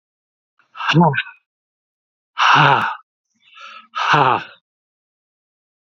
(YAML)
exhalation_length: 5.8 s
exhalation_amplitude: 32768
exhalation_signal_mean_std_ratio: 0.39
survey_phase: alpha (2021-03-01 to 2021-08-12)
age: 65+
gender: Male
wearing_mask: 'No'
symptom_fever_high_temperature: true
smoker_status: Never smoked
respiratory_condition_asthma: false
respiratory_condition_other: false
recruitment_source: Test and Trace
submission_delay: 2 days
covid_test_result: Positive
covid_test_method: RT-qPCR